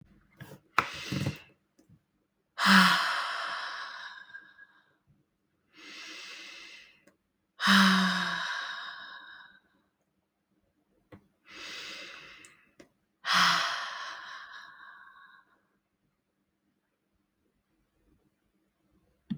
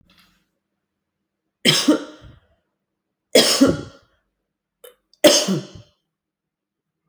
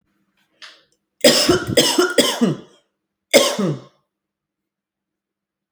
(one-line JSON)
{"exhalation_length": "19.4 s", "exhalation_amplitude": 15500, "exhalation_signal_mean_std_ratio": 0.34, "three_cough_length": "7.1 s", "three_cough_amplitude": 32767, "three_cough_signal_mean_std_ratio": 0.3, "cough_length": "5.7 s", "cough_amplitude": 30956, "cough_signal_mean_std_ratio": 0.4, "survey_phase": "beta (2021-08-13 to 2022-03-07)", "age": "18-44", "gender": "Female", "wearing_mask": "No", "symptom_none": true, "smoker_status": "Ex-smoker", "respiratory_condition_asthma": false, "respiratory_condition_other": false, "recruitment_source": "REACT", "submission_delay": "2 days", "covid_test_result": "Negative", "covid_test_method": "RT-qPCR"}